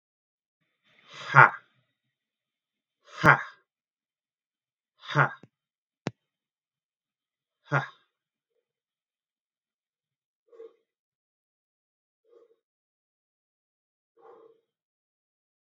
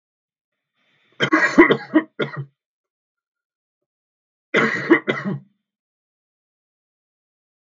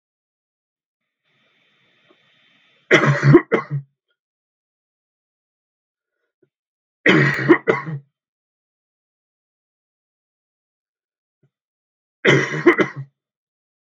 {"exhalation_length": "15.6 s", "exhalation_amplitude": 32660, "exhalation_signal_mean_std_ratio": 0.14, "cough_length": "7.7 s", "cough_amplitude": 32768, "cough_signal_mean_std_ratio": 0.3, "three_cough_length": "13.9 s", "three_cough_amplitude": 32768, "three_cough_signal_mean_std_ratio": 0.27, "survey_phase": "beta (2021-08-13 to 2022-03-07)", "age": "18-44", "gender": "Male", "wearing_mask": "No", "symptom_cough_any": true, "symptom_loss_of_taste": true, "symptom_onset": "3 days", "smoker_status": "Never smoked", "respiratory_condition_asthma": false, "respiratory_condition_other": false, "recruitment_source": "Test and Trace", "submission_delay": "2 days", "covid_test_result": "Positive", "covid_test_method": "RT-qPCR", "covid_ct_value": 31.4, "covid_ct_gene": "ORF1ab gene", "covid_ct_mean": 31.8, "covid_viral_load": "36 copies/ml", "covid_viral_load_category": "Minimal viral load (< 10K copies/ml)"}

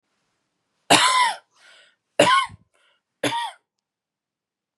{"three_cough_length": "4.8 s", "three_cough_amplitude": 30258, "three_cough_signal_mean_std_ratio": 0.35, "survey_phase": "beta (2021-08-13 to 2022-03-07)", "age": "18-44", "gender": "Female", "wearing_mask": "No", "symptom_none": true, "smoker_status": "Never smoked", "respiratory_condition_asthma": false, "respiratory_condition_other": false, "recruitment_source": "REACT", "submission_delay": "2 days", "covid_test_result": "Negative", "covid_test_method": "RT-qPCR", "influenza_a_test_result": "Negative", "influenza_b_test_result": "Negative"}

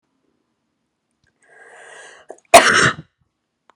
{"cough_length": "3.8 s", "cough_amplitude": 32768, "cough_signal_mean_std_ratio": 0.24, "survey_phase": "beta (2021-08-13 to 2022-03-07)", "age": "18-44", "gender": "Female", "wearing_mask": "No", "symptom_cough_any": true, "symptom_runny_or_blocked_nose": true, "symptom_headache": true, "symptom_change_to_sense_of_smell_or_taste": true, "symptom_loss_of_taste": true, "symptom_onset": "4 days", "smoker_status": "Never smoked", "respiratory_condition_asthma": true, "respiratory_condition_other": false, "recruitment_source": "Test and Trace", "submission_delay": "2 days", "covid_test_result": "Positive", "covid_test_method": "RT-qPCR", "covid_ct_value": 13.0, "covid_ct_gene": "ORF1ab gene", "covid_ct_mean": 13.4, "covid_viral_load": "40000000 copies/ml", "covid_viral_load_category": "High viral load (>1M copies/ml)"}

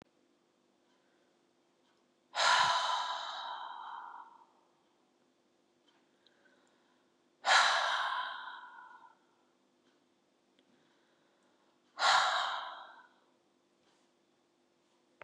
{"exhalation_length": "15.2 s", "exhalation_amplitude": 6284, "exhalation_signal_mean_std_ratio": 0.35, "survey_phase": "beta (2021-08-13 to 2022-03-07)", "age": "65+", "gender": "Female", "wearing_mask": "No", "symptom_abdominal_pain": true, "symptom_fatigue": true, "symptom_change_to_sense_of_smell_or_taste": true, "symptom_loss_of_taste": true, "smoker_status": "Ex-smoker", "respiratory_condition_asthma": false, "respiratory_condition_other": false, "recruitment_source": "REACT", "submission_delay": "2 days", "covid_test_result": "Negative", "covid_test_method": "RT-qPCR", "influenza_a_test_result": "Unknown/Void", "influenza_b_test_result": "Unknown/Void"}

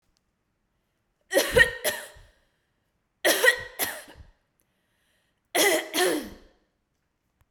{"three_cough_length": "7.5 s", "three_cough_amplitude": 19002, "three_cough_signal_mean_std_ratio": 0.35, "survey_phase": "beta (2021-08-13 to 2022-03-07)", "age": "45-64", "gender": "Female", "wearing_mask": "No", "symptom_none": true, "smoker_status": "Never smoked", "respiratory_condition_asthma": false, "respiratory_condition_other": false, "recruitment_source": "REACT", "submission_delay": "1 day", "covid_test_result": "Negative", "covid_test_method": "RT-qPCR"}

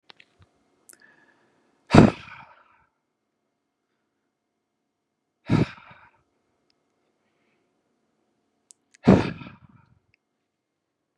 {"exhalation_length": "11.2 s", "exhalation_amplitude": 32768, "exhalation_signal_mean_std_ratio": 0.17, "survey_phase": "beta (2021-08-13 to 2022-03-07)", "age": "18-44", "gender": "Male", "wearing_mask": "No", "symptom_cough_any": true, "symptom_runny_or_blocked_nose": true, "symptom_fatigue": true, "symptom_fever_high_temperature": true, "symptom_onset": "4 days", "smoker_status": "Never smoked", "respiratory_condition_asthma": false, "respiratory_condition_other": false, "recruitment_source": "Test and Trace", "submission_delay": "2 days", "covid_test_result": "Positive", "covid_test_method": "RT-qPCR", "covid_ct_value": 26.2, "covid_ct_gene": "ORF1ab gene", "covid_ct_mean": 26.6, "covid_viral_load": "1900 copies/ml", "covid_viral_load_category": "Minimal viral load (< 10K copies/ml)"}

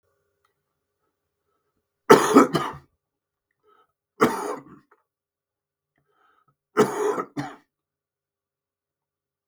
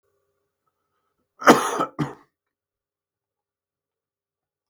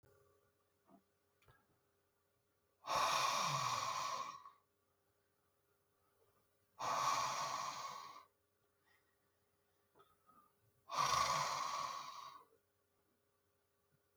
{"three_cough_length": "9.5 s", "three_cough_amplitude": 32766, "three_cough_signal_mean_std_ratio": 0.24, "cough_length": "4.7 s", "cough_amplitude": 32768, "cough_signal_mean_std_ratio": 0.2, "exhalation_length": "14.2 s", "exhalation_amplitude": 2425, "exhalation_signal_mean_std_ratio": 0.45, "survey_phase": "beta (2021-08-13 to 2022-03-07)", "age": "65+", "gender": "Male", "wearing_mask": "No", "symptom_cough_any": true, "symptom_runny_or_blocked_nose": true, "symptom_sore_throat": true, "symptom_headache": true, "smoker_status": "Never smoked", "respiratory_condition_asthma": false, "respiratory_condition_other": false, "recruitment_source": "Test and Trace", "submission_delay": "2 days", "covid_test_result": "Positive", "covid_test_method": "ePCR"}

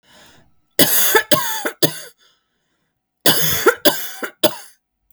{"cough_length": "5.1 s", "cough_amplitude": 32768, "cough_signal_mean_std_ratio": 0.44, "survey_phase": "beta (2021-08-13 to 2022-03-07)", "age": "45-64", "gender": "Female", "wearing_mask": "No", "symptom_cough_any": true, "symptom_sore_throat": true, "symptom_fatigue": true, "symptom_headache": true, "symptom_onset": "5 days", "smoker_status": "Ex-smoker", "respiratory_condition_asthma": false, "respiratory_condition_other": false, "recruitment_source": "REACT", "submission_delay": "3 days", "covid_test_result": "Negative", "covid_test_method": "RT-qPCR", "influenza_a_test_result": "Negative", "influenza_b_test_result": "Negative"}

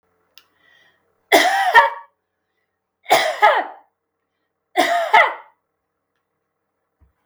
{"three_cough_length": "7.3 s", "three_cough_amplitude": 32768, "three_cough_signal_mean_std_ratio": 0.36, "survey_phase": "beta (2021-08-13 to 2022-03-07)", "age": "65+", "gender": "Female", "wearing_mask": "No", "symptom_none": true, "smoker_status": "Never smoked", "respiratory_condition_asthma": false, "respiratory_condition_other": false, "recruitment_source": "REACT", "submission_delay": "2 days", "covid_test_result": "Negative", "covid_test_method": "RT-qPCR", "influenza_a_test_result": "Negative", "influenza_b_test_result": "Negative"}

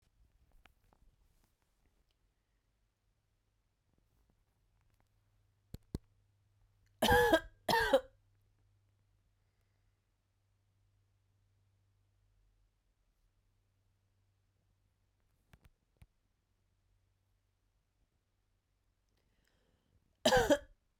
{"cough_length": "21.0 s", "cough_amplitude": 6434, "cough_signal_mean_std_ratio": 0.18, "survey_phase": "beta (2021-08-13 to 2022-03-07)", "age": "18-44", "gender": "Female", "wearing_mask": "No", "symptom_cough_any": true, "symptom_runny_or_blocked_nose": true, "symptom_sore_throat": true, "symptom_fatigue": true, "symptom_headache": true, "symptom_onset": "3 days", "smoker_status": "Ex-smoker", "respiratory_condition_asthma": false, "respiratory_condition_other": false, "recruitment_source": "Test and Trace", "submission_delay": "2 days", "covid_test_result": "Positive", "covid_test_method": "ePCR"}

